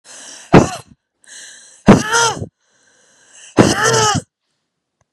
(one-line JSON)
{"exhalation_length": "5.1 s", "exhalation_amplitude": 32768, "exhalation_signal_mean_std_ratio": 0.38, "survey_phase": "beta (2021-08-13 to 2022-03-07)", "age": "45-64", "gender": "Male", "wearing_mask": "No", "symptom_cough_any": true, "symptom_runny_or_blocked_nose": true, "symptom_sore_throat": true, "symptom_fatigue": true, "symptom_headache": true, "smoker_status": "Never smoked", "respiratory_condition_asthma": false, "respiratory_condition_other": false, "recruitment_source": "Test and Trace", "submission_delay": "0 days", "covid_test_result": "Negative", "covid_test_method": "RT-qPCR"}